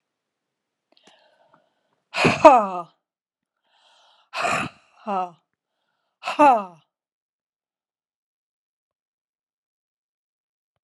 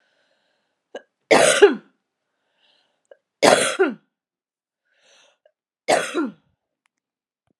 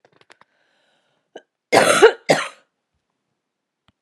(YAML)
exhalation_length: 10.8 s
exhalation_amplitude: 32768
exhalation_signal_mean_std_ratio: 0.23
three_cough_length: 7.6 s
three_cough_amplitude: 32768
three_cough_signal_mean_std_ratio: 0.29
cough_length: 4.0 s
cough_amplitude: 32768
cough_signal_mean_std_ratio: 0.27
survey_phase: alpha (2021-03-01 to 2021-08-12)
age: 45-64
gender: Female
wearing_mask: 'No'
symptom_none: true
smoker_status: Ex-smoker
respiratory_condition_asthma: true
respiratory_condition_other: false
recruitment_source: REACT
submission_delay: 2 days
covid_test_result: Negative
covid_test_method: RT-qPCR